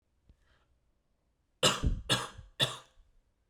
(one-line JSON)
{"three_cough_length": "3.5 s", "three_cough_amplitude": 9068, "three_cough_signal_mean_std_ratio": 0.34, "survey_phase": "beta (2021-08-13 to 2022-03-07)", "age": "18-44", "gender": "Male", "wearing_mask": "No", "symptom_cough_any": true, "symptom_runny_or_blocked_nose": true, "symptom_fatigue": true, "smoker_status": "Never smoked", "recruitment_source": "Test and Trace", "submission_delay": "1 day", "covid_test_result": "Positive", "covid_test_method": "RT-qPCR", "covid_ct_value": 19.6, "covid_ct_gene": "ORF1ab gene", "covid_ct_mean": 20.1, "covid_viral_load": "260000 copies/ml", "covid_viral_load_category": "Low viral load (10K-1M copies/ml)"}